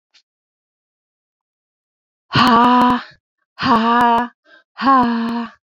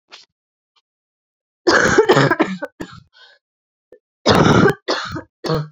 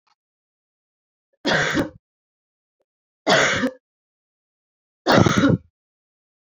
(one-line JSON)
{"exhalation_length": "5.6 s", "exhalation_amplitude": 28053, "exhalation_signal_mean_std_ratio": 0.52, "cough_length": "5.7 s", "cough_amplitude": 32410, "cough_signal_mean_std_ratio": 0.44, "three_cough_length": "6.5 s", "three_cough_amplitude": 27451, "three_cough_signal_mean_std_ratio": 0.35, "survey_phase": "alpha (2021-03-01 to 2021-08-12)", "age": "18-44", "gender": "Female", "wearing_mask": "No", "symptom_cough_any": true, "symptom_fatigue": true, "symptom_headache": true, "symptom_onset": "3 days", "smoker_status": "Never smoked", "respiratory_condition_asthma": false, "respiratory_condition_other": false, "recruitment_source": "Test and Trace", "submission_delay": "2 days", "covid_test_result": "Positive", "covid_test_method": "RT-qPCR", "covid_ct_value": 18.6, "covid_ct_gene": "ORF1ab gene", "covid_ct_mean": 18.6, "covid_viral_load": "770000 copies/ml", "covid_viral_load_category": "Low viral load (10K-1M copies/ml)"}